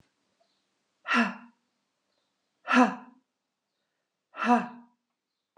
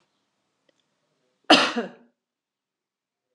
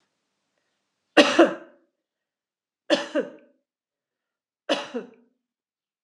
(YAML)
exhalation_length: 5.6 s
exhalation_amplitude: 12563
exhalation_signal_mean_std_ratio: 0.28
cough_length: 3.3 s
cough_amplitude: 27643
cough_signal_mean_std_ratio: 0.21
three_cough_length: 6.0 s
three_cough_amplitude: 30398
three_cough_signal_mean_std_ratio: 0.24
survey_phase: alpha (2021-03-01 to 2021-08-12)
age: 65+
gender: Female
wearing_mask: 'No'
symptom_none: true
smoker_status: Ex-smoker
respiratory_condition_asthma: false
respiratory_condition_other: false
recruitment_source: REACT
submission_delay: 1 day
covid_test_result: Negative
covid_test_method: RT-qPCR